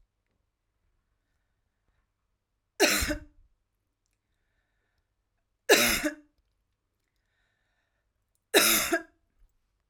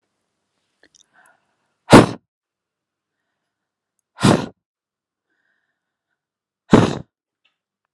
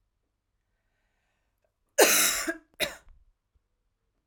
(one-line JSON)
{"three_cough_length": "9.9 s", "three_cough_amplitude": 18440, "three_cough_signal_mean_std_ratio": 0.26, "exhalation_length": "7.9 s", "exhalation_amplitude": 32768, "exhalation_signal_mean_std_ratio": 0.19, "cough_length": "4.3 s", "cough_amplitude": 21246, "cough_signal_mean_std_ratio": 0.28, "survey_phase": "alpha (2021-03-01 to 2021-08-12)", "age": "18-44", "gender": "Female", "wearing_mask": "No", "symptom_none": true, "symptom_onset": "9 days", "smoker_status": "Never smoked", "respiratory_condition_asthma": false, "respiratory_condition_other": false, "recruitment_source": "REACT", "submission_delay": "2 days", "covid_test_result": "Negative", "covid_test_method": "RT-qPCR"}